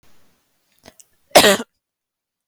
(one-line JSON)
{"cough_length": "2.5 s", "cough_amplitude": 32768, "cough_signal_mean_std_ratio": 0.23, "survey_phase": "beta (2021-08-13 to 2022-03-07)", "age": "18-44", "gender": "Female", "wearing_mask": "No", "symptom_sore_throat": true, "symptom_fatigue": true, "symptom_headache": true, "symptom_onset": "1 day", "smoker_status": "Never smoked", "respiratory_condition_asthma": false, "respiratory_condition_other": false, "recruitment_source": "Test and Trace", "submission_delay": "1 day", "covid_test_result": "Positive", "covid_test_method": "RT-qPCR", "covid_ct_value": 20.7, "covid_ct_gene": "ORF1ab gene"}